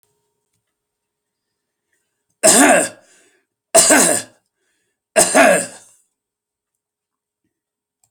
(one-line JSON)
{"three_cough_length": "8.1 s", "three_cough_amplitude": 32768, "three_cough_signal_mean_std_ratio": 0.33, "survey_phase": "alpha (2021-03-01 to 2021-08-12)", "age": "65+", "gender": "Male", "wearing_mask": "No", "symptom_none": true, "smoker_status": "Ex-smoker", "respiratory_condition_asthma": false, "respiratory_condition_other": false, "recruitment_source": "REACT", "submission_delay": "1 day", "covid_test_result": "Negative", "covid_test_method": "RT-qPCR"}